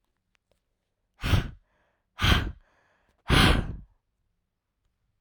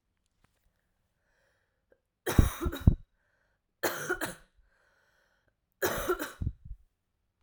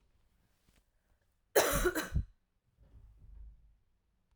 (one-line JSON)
{"exhalation_length": "5.2 s", "exhalation_amplitude": 15013, "exhalation_signal_mean_std_ratio": 0.33, "three_cough_length": "7.4 s", "three_cough_amplitude": 16427, "three_cough_signal_mean_std_ratio": 0.28, "cough_length": "4.4 s", "cough_amplitude": 8279, "cough_signal_mean_std_ratio": 0.31, "survey_phase": "alpha (2021-03-01 to 2021-08-12)", "age": "18-44", "gender": "Female", "wearing_mask": "No", "symptom_abdominal_pain": true, "symptom_fatigue": true, "symptom_fever_high_temperature": true, "symptom_headache": true, "smoker_status": "Current smoker (1 to 10 cigarettes per day)", "respiratory_condition_asthma": false, "respiratory_condition_other": false, "recruitment_source": "Test and Trace", "submission_delay": "2 days", "covid_test_result": "Positive", "covid_test_method": "RT-qPCR", "covid_ct_value": 17.3, "covid_ct_gene": "ORF1ab gene", "covid_ct_mean": 17.8, "covid_viral_load": "1500000 copies/ml", "covid_viral_load_category": "High viral load (>1M copies/ml)"}